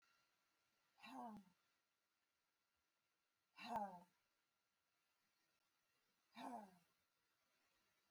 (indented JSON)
{
  "exhalation_length": "8.1 s",
  "exhalation_amplitude": 524,
  "exhalation_signal_mean_std_ratio": 0.3,
  "survey_phase": "alpha (2021-03-01 to 2021-08-12)",
  "age": "45-64",
  "gender": "Female",
  "wearing_mask": "No",
  "symptom_none": true,
  "smoker_status": "Never smoked",
  "respiratory_condition_asthma": false,
  "respiratory_condition_other": false,
  "recruitment_source": "REACT",
  "submission_delay": "2 days",
  "covid_test_result": "Negative",
  "covid_test_method": "RT-qPCR"
}